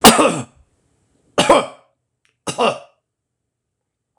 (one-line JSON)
{"cough_length": "4.2 s", "cough_amplitude": 26028, "cough_signal_mean_std_ratio": 0.32, "survey_phase": "beta (2021-08-13 to 2022-03-07)", "age": "65+", "gender": "Male", "wearing_mask": "No", "symptom_none": true, "smoker_status": "Never smoked", "respiratory_condition_asthma": false, "respiratory_condition_other": false, "recruitment_source": "REACT", "submission_delay": "2 days", "covid_test_result": "Negative", "covid_test_method": "RT-qPCR", "influenza_a_test_result": "Negative", "influenza_b_test_result": "Negative"}